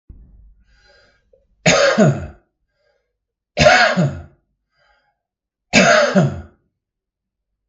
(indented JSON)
{
  "three_cough_length": "7.7 s",
  "three_cough_amplitude": 32768,
  "three_cough_signal_mean_std_ratio": 0.39,
  "survey_phase": "beta (2021-08-13 to 2022-03-07)",
  "age": "65+",
  "gender": "Male",
  "wearing_mask": "No",
  "symptom_headache": true,
  "symptom_onset": "7 days",
  "smoker_status": "Ex-smoker",
  "respiratory_condition_asthma": false,
  "respiratory_condition_other": false,
  "recruitment_source": "REACT",
  "submission_delay": "1 day",
  "covid_test_result": "Negative",
  "covid_test_method": "RT-qPCR",
  "influenza_a_test_result": "Negative",
  "influenza_b_test_result": "Negative"
}